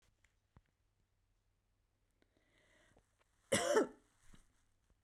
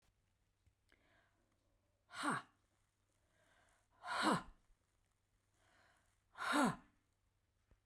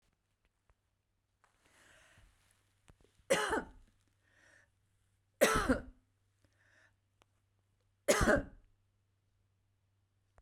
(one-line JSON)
{"cough_length": "5.0 s", "cough_amplitude": 3946, "cough_signal_mean_std_ratio": 0.23, "exhalation_length": "7.9 s", "exhalation_amplitude": 2322, "exhalation_signal_mean_std_ratio": 0.29, "three_cough_length": "10.4 s", "three_cough_amplitude": 6673, "three_cough_signal_mean_std_ratio": 0.25, "survey_phase": "beta (2021-08-13 to 2022-03-07)", "age": "65+", "gender": "Female", "wearing_mask": "No", "symptom_none": true, "symptom_onset": "9 days", "smoker_status": "Never smoked", "respiratory_condition_asthma": false, "respiratory_condition_other": false, "recruitment_source": "REACT", "submission_delay": "2 days", "covid_test_result": "Negative", "covid_test_method": "RT-qPCR"}